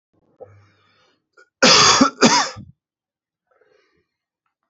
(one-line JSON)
{"cough_length": "4.7 s", "cough_amplitude": 32645, "cough_signal_mean_std_ratio": 0.32, "survey_phase": "alpha (2021-03-01 to 2021-08-12)", "age": "18-44", "gender": "Male", "wearing_mask": "No", "symptom_cough_any": true, "symptom_fatigue": true, "symptom_headache": true, "smoker_status": "Never smoked", "respiratory_condition_asthma": false, "respiratory_condition_other": false, "recruitment_source": "Test and Trace", "submission_delay": "37 days", "covid_test_result": "Negative", "covid_test_method": "RT-qPCR"}